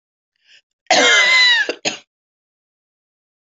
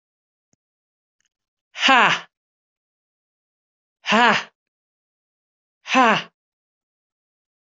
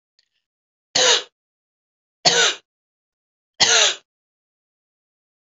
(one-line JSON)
{"cough_length": "3.6 s", "cough_amplitude": 32263, "cough_signal_mean_std_ratio": 0.43, "exhalation_length": "7.7 s", "exhalation_amplitude": 25259, "exhalation_signal_mean_std_ratio": 0.26, "three_cough_length": "5.5 s", "three_cough_amplitude": 32767, "three_cough_signal_mean_std_ratio": 0.31, "survey_phase": "alpha (2021-03-01 to 2021-08-12)", "age": "45-64", "gender": "Female", "wearing_mask": "No", "symptom_none": true, "symptom_onset": "12 days", "smoker_status": "Never smoked", "respiratory_condition_asthma": false, "respiratory_condition_other": false, "recruitment_source": "REACT", "submission_delay": "2 days", "covid_test_method": "RT-qPCR"}